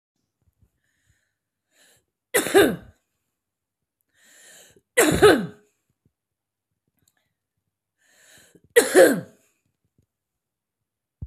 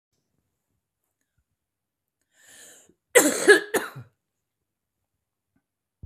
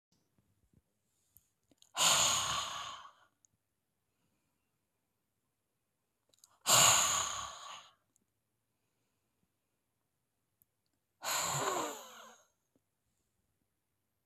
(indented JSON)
{
  "three_cough_length": "11.3 s",
  "three_cough_amplitude": 25439,
  "three_cough_signal_mean_std_ratio": 0.25,
  "cough_length": "6.1 s",
  "cough_amplitude": 27757,
  "cough_signal_mean_std_ratio": 0.21,
  "exhalation_length": "14.3 s",
  "exhalation_amplitude": 7220,
  "exhalation_signal_mean_std_ratio": 0.31,
  "survey_phase": "beta (2021-08-13 to 2022-03-07)",
  "age": "45-64",
  "gender": "Female",
  "wearing_mask": "No",
  "symptom_cough_any": true,
  "symptom_runny_or_blocked_nose": true,
  "symptom_sore_throat": true,
  "symptom_onset": "2 days",
  "smoker_status": "Current smoker (11 or more cigarettes per day)",
  "respiratory_condition_asthma": true,
  "respiratory_condition_other": false,
  "recruitment_source": "REACT",
  "submission_delay": "1 day",
  "covid_test_result": "Negative",
  "covid_test_method": "RT-qPCR",
  "influenza_a_test_result": "Negative",
  "influenza_b_test_result": "Negative"
}